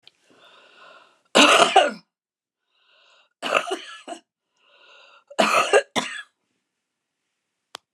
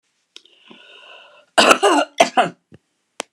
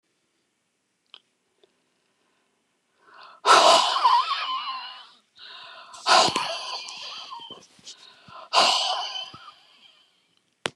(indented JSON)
{
  "three_cough_length": "7.9 s",
  "three_cough_amplitude": 29204,
  "three_cough_signal_mean_std_ratio": 0.31,
  "cough_length": "3.3 s",
  "cough_amplitude": 29204,
  "cough_signal_mean_std_ratio": 0.35,
  "exhalation_length": "10.8 s",
  "exhalation_amplitude": 24091,
  "exhalation_signal_mean_std_ratio": 0.39,
  "survey_phase": "beta (2021-08-13 to 2022-03-07)",
  "age": "65+",
  "gender": "Female",
  "wearing_mask": "No",
  "symptom_cough_any": true,
  "symptom_runny_or_blocked_nose": true,
  "smoker_status": "Prefer not to say",
  "respiratory_condition_asthma": true,
  "respiratory_condition_other": false,
  "recruitment_source": "REACT",
  "submission_delay": "2 days",
  "covid_test_result": "Negative",
  "covid_test_method": "RT-qPCR"
}